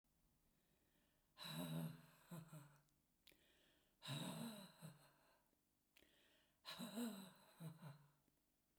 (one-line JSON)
{"exhalation_length": "8.8 s", "exhalation_amplitude": 419, "exhalation_signal_mean_std_ratio": 0.5, "survey_phase": "beta (2021-08-13 to 2022-03-07)", "age": "65+", "gender": "Female", "wearing_mask": "No", "symptom_none": true, "smoker_status": "Ex-smoker", "respiratory_condition_asthma": false, "respiratory_condition_other": false, "recruitment_source": "REACT", "submission_delay": "1 day", "covid_test_result": "Negative", "covid_test_method": "RT-qPCR"}